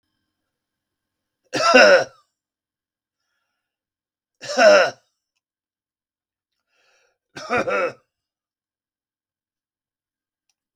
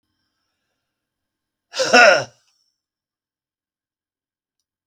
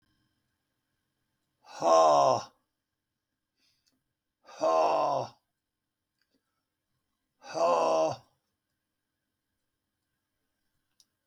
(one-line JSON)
{"three_cough_length": "10.8 s", "three_cough_amplitude": 32768, "three_cough_signal_mean_std_ratio": 0.25, "cough_length": "4.9 s", "cough_amplitude": 32768, "cough_signal_mean_std_ratio": 0.22, "exhalation_length": "11.3 s", "exhalation_amplitude": 10230, "exhalation_signal_mean_std_ratio": 0.33, "survey_phase": "beta (2021-08-13 to 2022-03-07)", "age": "65+", "gender": "Male", "wearing_mask": "No", "symptom_none": true, "smoker_status": "Never smoked", "respiratory_condition_asthma": false, "respiratory_condition_other": false, "recruitment_source": "REACT", "submission_delay": "4 days", "covid_test_result": "Negative", "covid_test_method": "RT-qPCR", "influenza_a_test_result": "Negative", "influenza_b_test_result": "Negative"}